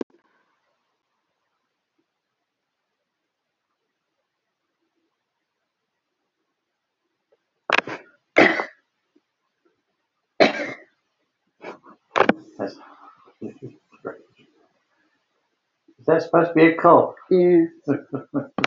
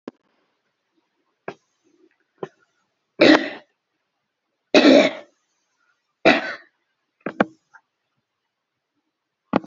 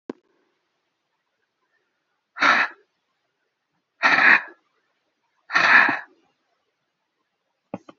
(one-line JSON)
{"cough_length": "18.7 s", "cough_amplitude": 29897, "cough_signal_mean_std_ratio": 0.27, "three_cough_length": "9.7 s", "three_cough_amplitude": 29816, "three_cough_signal_mean_std_ratio": 0.24, "exhalation_length": "8.0 s", "exhalation_amplitude": 26362, "exhalation_signal_mean_std_ratio": 0.29, "survey_phase": "alpha (2021-03-01 to 2021-08-12)", "age": "65+", "gender": "Female", "wearing_mask": "No", "symptom_none": true, "smoker_status": "Ex-smoker", "respiratory_condition_asthma": false, "respiratory_condition_other": false, "recruitment_source": "REACT", "submission_delay": "2 days", "covid_test_result": "Negative", "covid_test_method": "RT-qPCR"}